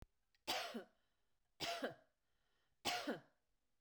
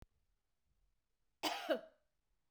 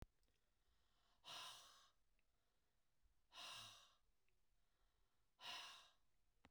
{"three_cough_length": "3.8 s", "three_cough_amplitude": 1618, "three_cough_signal_mean_std_ratio": 0.42, "cough_length": "2.5 s", "cough_amplitude": 2683, "cough_signal_mean_std_ratio": 0.29, "exhalation_length": "6.5 s", "exhalation_amplitude": 258, "exhalation_signal_mean_std_ratio": 0.49, "survey_phase": "beta (2021-08-13 to 2022-03-07)", "age": "65+", "gender": "Female", "wearing_mask": "No", "symptom_none": true, "smoker_status": "Ex-smoker", "respiratory_condition_asthma": false, "respiratory_condition_other": false, "recruitment_source": "REACT", "submission_delay": "1 day", "covid_test_result": "Negative", "covid_test_method": "RT-qPCR"}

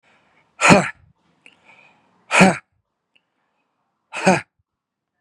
{"exhalation_length": "5.2 s", "exhalation_amplitude": 32768, "exhalation_signal_mean_std_ratio": 0.27, "survey_phase": "beta (2021-08-13 to 2022-03-07)", "age": "45-64", "gender": "Male", "wearing_mask": "No", "symptom_none": true, "smoker_status": "Ex-smoker", "respiratory_condition_asthma": false, "respiratory_condition_other": false, "recruitment_source": "REACT", "submission_delay": "1 day", "covid_test_result": "Negative", "covid_test_method": "RT-qPCR", "influenza_a_test_result": "Negative", "influenza_b_test_result": "Negative"}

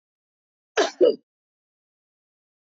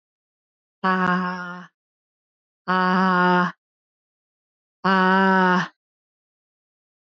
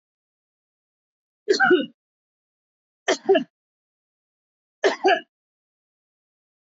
{"cough_length": "2.6 s", "cough_amplitude": 13686, "cough_signal_mean_std_ratio": 0.24, "exhalation_length": "7.1 s", "exhalation_amplitude": 16529, "exhalation_signal_mean_std_ratio": 0.46, "three_cough_length": "6.7 s", "three_cough_amplitude": 15038, "three_cough_signal_mean_std_ratio": 0.27, "survey_phase": "alpha (2021-03-01 to 2021-08-12)", "age": "45-64", "gender": "Female", "wearing_mask": "No", "symptom_none": true, "symptom_onset": "13 days", "smoker_status": "Ex-smoker", "respiratory_condition_asthma": false, "respiratory_condition_other": false, "recruitment_source": "REACT", "submission_delay": "2 days", "covid_test_result": "Negative", "covid_test_method": "RT-qPCR"}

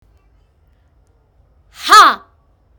{"exhalation_length": "2.8 s", "exhalation_amplitude": 32768, "exhalation_signal_mean_std_ratio": 0.26, "survey_phase": "beta (2021-08-13 to 2022-03-07)", "age": "18-44", "gender": "Male", "wearing_mask": "Yes", "symptom_cough_any": true, "symptom_runny_or_blocked_nose": true, "symptom_sore_throat": true, "symptom_headache": true, "symptom_other": true, "symptom_onset": "8 days", "smoker_status": "Never smoked", "respiratory_condition_asthma": false, "respiratory_condition_other": false, "recruitment_source": "Test and Trace", "submission_delay": "4 days", "covid_test_result": "Positive", "covid_test_method": "RT-qPCR", "covid_ct_value": 22.3, "covid_ct_gene": "ORF1ab gene"}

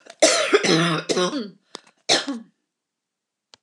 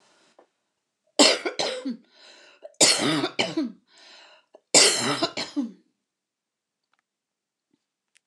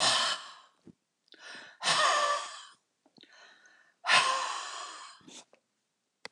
{"cough_length": "3.6 s", "cough_amplitude": 27993, "cough_signal_mean_std_ratio": 0.49, "three_cough_length": "8.3 s", "three_cough_amplitude": 24512, "three_cough_signal_mean_std_ratio": 0.36, "exhalation_length": "6.3 s", "exhalation_amplitude": 9818, "exhalation_signal_mean_std_ratio": 0.45, "survey_phase": "beta (2021-08-13 to 2022-03-07)", "age": "65+", "gender": "Female", "wearing_mask": "No", "symptom_none": true, "smoker_status": "Prefer not to say", "respiratory_condition_asthma": false, "respiratory_condition_other": false, "recruitment_source": "REACT", "submission_delay": "3 days", "covid_test_result": "Negative", "covid_test_method": "RT-qPCR", "influenza_a_test_result": "Negative", "influenza_b_test_result": "Negative"}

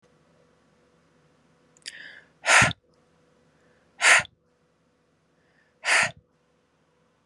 {"exhalation_length": "7.3 s", "exhalation_amplitude": 21948, "exhalation_signal_mean_std_ratio": 0.25, "survey_phase": "beta (2021-08-13 to 2022-03-07)", "age": "18-44", "gender": "Female", "wearing_mask": "No", "symptom_none": true, "smoker_status": "Never smoked", "respiratory_condition_asthma": false, "respiratory_condition_other": false, "recruitment_source": "REACT", "submission_delay": "5 days", "covid_test_result": "Negative", "covid_test_method": "RT-qPCR", "influenza_a_test_result": "Negative", "influenza_b_test_result": "Negative"}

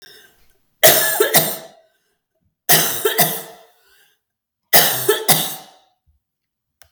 {"three_cough_length": "6.9 s", "three_cough_amplitude": 32768, "three_cough_signal_mean_std_ratio": 0.42, "survey_phase": "beta (2021-08-13 to 2022-03-07)", "age": "45-64", "gender": "Female", "wearing_mask": "No", "symptom_none": true, "smoker_status": "Never smoked", "respiratory_condition_asthma": true, "respiratory_condition_other": true, "recruitment_source": "REACT", "submission_delay": "21 days", "covid_test_result": "Negative", "covid_test_method": "RT-qPCR", "influenza_a_test_result": "Negative", "influenza_b_test_result": "Negative"}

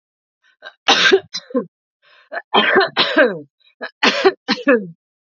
{"three_cough_length": "5.2 s", "three_cough_amplitude": 32767, "three_cough_signal_mean_std_ratio": 0.47, "survey_phase": "beta (2021-08-13 to 2022-03-07)", "age": "18-44", "gender": "Female", "wearing_mask": "No", "symptom_none": true, "smoker_status": "Never smoked", "respiratory_condition_asthma": false, "respiratory_condition_other": false, "recruitment_source": "REACT", "submission_delay": "2 days", "covid_test_result": "Negative", "covid_test_method": "RT-qPCR", "influenza_a_test_result": "Negative", "influenza_b_test_result": "Negative"}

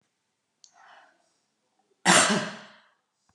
{"cough_length": "3.3 s", "cough_amplitude": 17746, "cough_signal_mean_std_ratio": 0.28, "survey_phase": "beta (2021-08-13 to 2022-03-07)", "age": "45-64", "gender": "Female", "wearing_mask": "No", "symptom_none": true, "smoker_status": "Never smoked", "respiratory_condition_asthma": false, "respiratory_condition_other": false, "recruitment_source": "REACT", "submission_delay": "1 day", "covid_test_result": "Negative", "covid_test_method": "RT-qPCR", "influenza_a_test_result": "Negative", "influenza_b_test_result": "Negative"}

